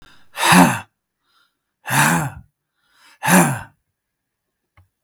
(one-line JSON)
{"exhalation_length": "5.0 s", "exhalation_amplitude": 32768, "exhalation_signal_mean_std_ratio": 0.37, "survey_phase": "beta (2021-08-13 to 2022-03-07)", "age": "45-64", "gender": "Male", "wearing_mask": "No", "symptom_sore_throat": true, "smoker_status": "Never smoked", "respiratory_condition_asthma": false, "respiratory_condition_other": false, "recruitment_source": "REACT", "submission_delay": "2 days", "covid_test_result": "Negative", "covid_test_method": "RT-qPCR", "influenza_a_test_result": "Negative", "influenza_b_test_result": "Negative"}